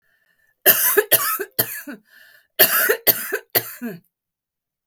cough_length: 4.9 s
cough_amplitude: 32768
cough_signal_mean_std_ratio: 0.43
survey_phase: beta (2021-08-13 to 2022-03-07)
age: 45-64
gender: Female
wearing_mask: 'No'
symptom_headache: true
smoker_status: Current smoker (e-cigarettes or vapes only)
respiratory_condition_asthma: true
respiratory_condition_other: false
recruitment_source: REACT
submission_delay: 1 day
covid_test_result: Negative
covid_test_method: RT-qPCR
influenza_a_test_result: Negative
influenza_b_test_result: Negative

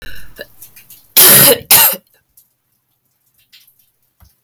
cough_length: 4.4 s
cough_amplitude: 32768
cough_signal_mean_std_ratio: 0.37
survey_phase: alpha (2021-03-01 to 2021-08-12)
age: 18-44
gender: Female
wearing_mask: 'No'
symptom_fatigue: true
smoker_status: Never smoked
respiratory_condition_asthma: true
respiratory_condition_other: false
recruitment_source: Test and Trace
submission_delay: 4 days
covid_test_result: Positive
covid_test_method: RT-qPCR
covid_ct_value: 22.4
covid_ct_gene: N gene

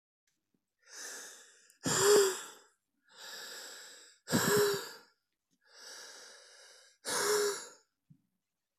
exhalation_length: 8.8 s
exhalation_amplitude: 6544
exhalation_signal_mean_std_ratio: 0.4
survey_phase: alpha (2021-03-01 to 2021-08-12)
age: 18-44
gender: Male
wearing_mask: 'No'
symptom_cough_any: true
symptom_fatigue: true
symptom_headache: true
symptom_onset: 5 days
smoker_status: Current smoker (e-cigarettes or vapes only)
respiratory_condition_asthma: false
respiratory_condition_other: false
recruitment_source: Test and Trace
submission_delay: 2 days
covid_test_result: Positive
covid_test_method: RT-qPCR
covid_ct_value: 23.0
covid_ct_gene: ORF1ab gene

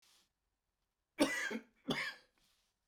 cough_length: 2.9 s
cough_amplitude: 4069
cough_signal_mean_std_ratio: 0.35
survey_phase: beta (2021-08-13 to 2022-03-07)
age: 65+
gender: Male
wearing_mask: 'No'
symptom_none: true
smoker_status: Ex-smoker
respiratory_condition_asthma: true
respiratory_condition_other: false
recruitment_source: REACT
submission_delay: 1 day
covid_test_result: Negative
covid_test_method: RT-qPCR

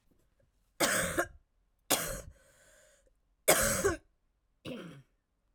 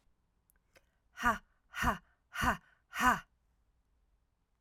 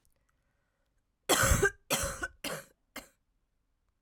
three_cough_length: 5.5 s
three_cough_amplitude: 13071
three_cough_signal_mean_std_ratio: 0.38
exhalation_length: 4.6 s
exhalation_amplitude: 5904
exhalation_signal_mean_std_ratio: 0.33
cough_length: 4.0 s
cough_amplitude: 7533
cough_signal_mean_std_ratio: 0.35
survey_phase: alpha (2021-03-01 to 2021-08-12)
age: 18-44
gender: Female
wearing_mask: 'No'
symptom_cough_any: true
symptom_onset: 7 days
smoker_status: Never smoked
respiratory_condition_asthma: false
respiratory_condition_other: false
recruitment_source: REACT
submission_delay: 1 day
covid_test_result: Negative
covid_test_method: RT-qPCR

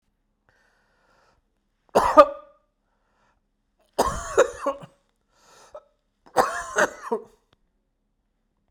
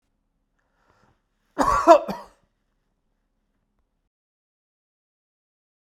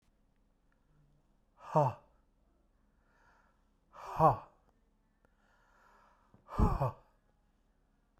three_cough_length: 8.7 s
three_cough_amplitude: 32768
three_cough_signal_mean_std_ratio: 0.25
cough_length: 5.8 s
cough_amplitude: 32768
cough_signal_mean_std_ratio: 0.19
exhalation_length: 8.2 s
exhalation_amplitude: 7584
exhalation_signal_mean_std_ratio: 0.25
survey_phase: beta (2021-08-13 to 2022-03-07)
age: 45-64
gender: Male
wearing_mask: 'No'
symptom_none: true
smoker_status: Never smoked
respiratory_condition_asthma: false
respiratory_condition_other: false
recruitment_source: REACT
submission_delay: 2 days
covid_test_result: Negative
covid_test_method: RT-qPCR
influenza_a_test_result: Negative
influenza_b_test_result: Negative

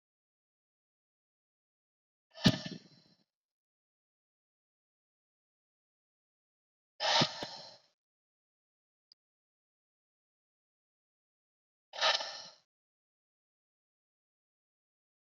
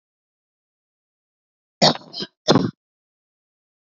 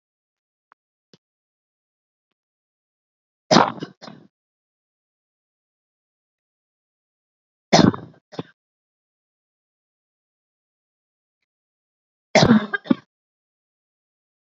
exhalation_length: 15.4 s
exhalation_amplitude: 9529
exhalation_signal_mean_std_ratio: 0.18
cough_length: 3.9 s
cough_amplitude: 29942
cough_signal_mean_std_ratio: 0.23
three_cough_length: 14.6 s
three_cough_amplitude: 29819
three_cough_signal_mean_std_ratio: 0.17
survey_phase: beta (2021-08-13 to 2022-03-07)
age: 18-44
gender: Female
wearing_mask: 'No'
symptom_none: true
smoker_status: Current smoker (1 to 10 cigarettes per day)
respiratory_condition_asthma: false
respiratory_condition_other: false
recruitment_source: REACT
submission_delay: 3 days
covid_test_result: Negative
covid_test_method: RT-qPCR
influenza_a_test_result: Negative
influenza_b_test_result: Negative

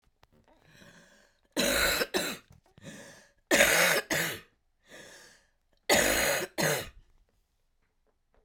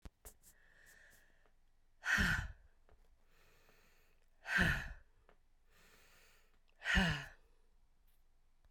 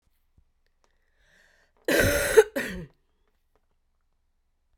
three_cough_length: 8.4 s
three_cough_amplitude: 17104
three_cough_signal_mean_std_ratio: 0.44
exhalation_length: 8.7 s
exhalation_amplitude: 3178
exhalation_signal_mean_std_ratio: 0.34
cough_length: 4.8 s
cough_amplitude: 22051
cough_signal_mean_std_ratio: 0.28
survey_phase: beta (2021-08-13 to 2022-03-07)
age: 45-64
gender: Female
wearing_mask: 'No'
symptom_cough_any: true
symptom_runny_or_blocked_nose: true
symptom_sore_throat: true
symptom_fatigue: true
symptom_fever_high_temperature: true
symptom_headache: true
symptom_onset: 2 days
smoker_status: Never smoked
respiratory_condition_asthma: false
respiratory_condition_other: false
recruitment_source: REACT
submission_delay: 9 days
covid_test_result: Negative
covid_test_method: RT-qPCR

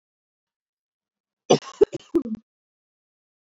three_cough_length: 3.6 s
three_cough_amplitude: 24507
three_cough_signal_mean_std_ratio: 0.19
survey_phase: beta (2021-08-13 to 2022-03-07)
age: 18-44
gender: Female
wearing_mask: 'No'
symptom_none: true
smoker_status: Never smoked
respiratory_condition_asthma: false
respiratory_condition_other: false
recruitment_source: REACT
submission_delay: 1 day
covid_test_result: Negative
covid_test_method: RT-qPCR
influenza_a_test_result: Negative
influenza_b_test_result: Negative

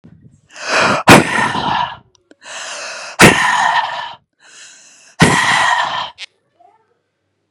exhalation_length: 7.5 s
exhalation_amplitude: 32768
exhalation_signal_mean_std_ratio: 0.5
survey_phase: beta (2021-08-13 to 2022-03-07)
age: 45-64
gender: Female
wearing_mask: 'No'
symptom_none: true
smoker_status: Ex-smoker
respiratory_condition_asthma: false
respiratory_condition_other: false
recruitment_source: REACT
submission_delay: 1 day
covid_test_result: Negative
covid_test_method: RT-qPCR
influenza_a_test_result: Unknown/Void
influenza_b_test_result: Unknown/Void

